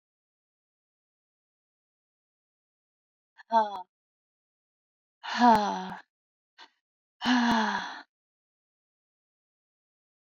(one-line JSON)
{"exhalation_length": "10.2 s", "exhalation_amplitude": 11345, "exhalation_signal_mean_std_ratio": 0.28, "survey_phase": "alpha (2021-03-01 to 2021-08-12)", "age": "45-64", "gender": "Female", "wearing_mask": "No", "symptom_none": true, "smoker_status": "Ex-smoker", "respiratory_condition_asthma": true, "respiratory_condition_other": false, "recruitment_source": "REACT", "submission_delay": "3 days", "covid_test_result": "Negative", "covid_test_method": "RT-qPCR"}